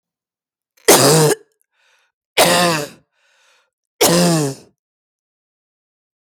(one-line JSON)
{"three_cough_length": "6.3 s", "three_cough_amplitude": 32768, "three_cough_signal_mean_std_ratio": 0.4, "survey_phase": "beta (2021-08-13 to 2022-03-07)", "age": "45-64", "gender": "Female", "wearing_mask": "No", "symptom_runny_or_blocked_nose": true, "symptom_fatigue": true, "smoker_status": "Ex-smoker", "respiratory_condition_asthma": false, "respiratory_condition_other": true, "recruitment_source": "REACT", "submission_delay": "3 days", "covid_test_result": "Negative", "covid_test_method": "RT-qPCR"}